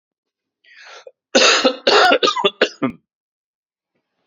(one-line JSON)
{"cough_length": "4.3 s", "cough_amplitude": 32767, "cough_signal_mean_std_ratio": 0.41, "survey_phase": "beta (2021-08-13 to 2022-03-07)", "age": "45-64", "gender": "Male", "wearing_mask": "No", "symptom_cough_any": true, "symptom_runny_or_blocked_nose": true, "symptom_onset": "13 days", "smoker_status": "Never smoked", "respiratory_condition_asthma": false, "respiratory_condition_other": false, "recruitment_source": "REACT", "submission_delay": "3 days", "covid_test_result": "Negative", "covid_test_method": "RT-qPCR", "influenza_a_test_result": "Negative", "influenza_b_test_result": "Negative"}